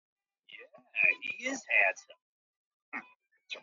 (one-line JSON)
{"cough_length": "3.6 s", "cough_amplitude": 7533, "cough_signal_mean_std_ratio": 0.35, "survey_phase": "beta (2021-08-13 to 2022-03-07)", "age": "18-44", "gender": "Male", "wearing_mask": "No", "symptom_cough_any": true, "symptom_new_continuous_cough": true, "symptom_runny_or_blocked_nose": true, "symptom_sore_throat": true, "symptom_fatigue": true, "symptom_fever_high_temperature": true, "symptom_headache": true, "smoker_status": "Never smoked", "respiratory_condition_asthma": false, "respiratory_condition_other": false, "recruitment_source": "Test and Trace", "submission_delay": "2 days", "covid_test_result": "Positive", "covid_test_method": "RT-qPCR"}